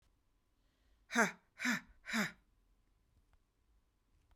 {"exhalation_length": "4.4 s", "exhalation_amplitude": 4022, "exhalation_signal_mean_std_ratio": 0.29, "survey_phase": "beta (2021-08-13 to 2022-03-07)", "age": "45-64", "gender": "Female", "wearing_mask": "No", "symptom_cough_any": true, "symptom_shortness_of_breath": true, "symptom_fatigue": true, "symptom_headache": true, "smoker_status": "Never smoked", "respiratory_condition_asthma": true, "respiratory_condition_other": false, "recruitment_source": "Test and Trace", "submission_delay": "2 days", "covid_test_result": "Positive", "covid_test_method": "RT-qPCR", "covid_ct_value": 20.2, "covid_ct_gene": "ORF1ab gene", "covid_ct_mean": 20.6, "covid_viral_load": "170000 copies/ml", "covid_viral_load_category": "Low viral load (10K-1M copies/ml)"}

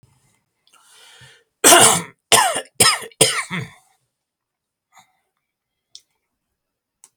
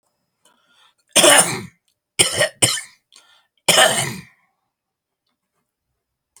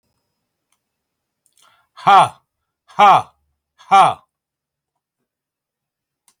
{"cough_length": "7.2 s", "cough_amplitude": 32768, "cough_signal_mean_std_ratio": 0.3, "three_cough_length": "6.4 s", "three_cough_amplitude": 32768, "three_cough_signal_mean_std_ratio": 0.33, "exhalation_length": "6.4 s", "exhalation_amplitude": 31034, "exhalation_signal_mean_std_ratio": 0.26, "survey_phase": "beta (2021-08-13 to 2022-03-07)", "age": "65+", "gender": "Male", "wearing_mask": "No", "symptom_none": true, "smoker_status": "Ex-smoker", "respiratory_condition_asthma": false, "respiratory_condition_other": true, "recruitment_source": "REACT", "submission_delay": "1 day", "covid_test_result": "Negative", "covid_test_method": "RT-qPCR"}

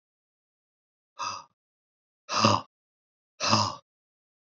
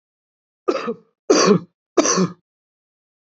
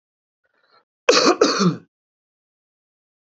{"exhalation_length": "4.5 s", "exhalation_amplitude": 16084, "exhalation_signal_mean_std_ratio": 0.3, "three_cough_length": "3.2 s", "three_cough_amplitude": 28010, "three_cough_signal_mean_std_ratio": 0.39, "cough_length": "3.3 s", "cough_amplitude": 28224, "cough_signal_mean_std_ratio": 0.33, "survey_phase": "beta (2021-08-13 to 2022-03-07)", "age": "45-64", "gender": "Male", "wearing_mask": "Yes", "symptom_cough_any": true, "symptom_runny_or_blocked_nose": true, "symptom_shortness_of_breath": true, "symptom_fatigue": true, "symptom_headache": true, "symptom_onset": "3 days", "smoker_status": "Ex-smoker", "respiratory_condition_asthma": false, "respiratory_condition_other": false, "recruitment_source": "Test and Trace", "submission_delay": "1 day", "covid_test_result": "Positive", "covid_test_method": "RT-qPCR", "covid_ct_value": 17.6, "covid_ct_gene": "ORF1ab gene"}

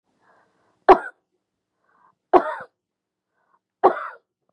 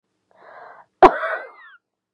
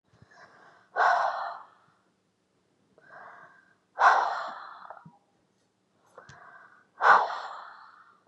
{"three_cough_length": "4.5 s", "three_cough_amplitude": 32767, "three_cough_signal_mean_std_ratio": 0.21, "cough_length": "2.1 s", "cough_amplitude": 32768, "cough_signal_mean_std_ratio": 0.23, "exhalation_length": "8.3 s", "exhalation_amplitude": 19711, "exhalation_signal_mean_std_ratio": 0.33, "survey_phase": "beta (2021-08-13 to 2022-03-07)", "age": "45-64", "gender": "Female", "wearing_mask": "No", "symptom_none": true, "smoker_status": "Never smoked", "respiratory_condition_asthma": false, "respiratory_condition_other": false, "recruitment_source": "REACT", "submission_delay": "6 days", "covid_test_result": "Negative", "covid_test_method": "RT-qPCR", "influenza_a_test_result": "Negative", "influenza_b_test_result": "Negative"}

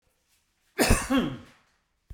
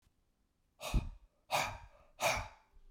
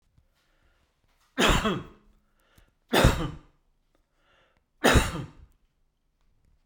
{"cough_length": "2.1 s", "cough_amplitude": 16027, "cough_signal_mean_std_ratio": 0.38, "exhalation_length": "2.9 s", "exhalation_amplitude": 3094, "exhalation_signal_mean_std_ratio": 0.42, "three_cough_length": "6.7 s", "three_cough_amplitude": 19761, "three_cough_signal_mean_std_ratio": 0.31, "survey_phase": "beta (2021-08-13 to 2022-03-07)", "age": "65+", "gender": "Male", "wearing_mask": "No", "symptom_none": true, "smoker_status": "Ex-smoker", "respiratory_condition_asthma": false, "respiratory_condition_other": false, "recruitment_source": "REACT", "submission_delay": "2 days", "covid_test_result": "Negative", "covid_test_method": "RT-qPCR"}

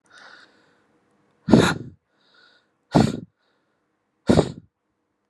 {"exhalation_length": "5.3 s", "exhalation_amplitude": 32768, "exhalation_signal_mean_std_ratio": 0.26, "survey_phase": "alpha (2021-03-01 to 2021-08-12)", "age": "18-44", "gender": "Male", "wearing_mask": "No", "symptom_cough_any": true, "symptom_fatigue": true, "symptom_fever_high_temperature": true, "symptom_headache": true, "symptom_onset": "2 days", "smoker_status": "Never smoked", "respiratory_condition_asthma": true, "respiratory_condition_other": false, "recruitment_source": "Test and Trace", "submission_delay": "1 day", "covid_test_result": "Positive", "covid_test_method": "RT-qPCR"}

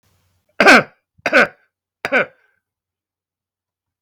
{"three_cough_length": "4.0 s", "three_cough_amplitude": 32768, "three_cough_signal_mean_std_ratio": 0.28, "survey_phase": "beta (2021-08-13 to 2022-03-07)", "age": "65+", "gender": "Male", "wearing_mask": "No", "symptom_none": true, "smoker_status": "Never smoked", "respiratory_condition_asthma": true, "respiratory_condition_other": false, "recruitment_source": "REACT", "submission_delay": "2 days", "covid_test_result": "Negative", "covid_test_method": "RT-qPCR"}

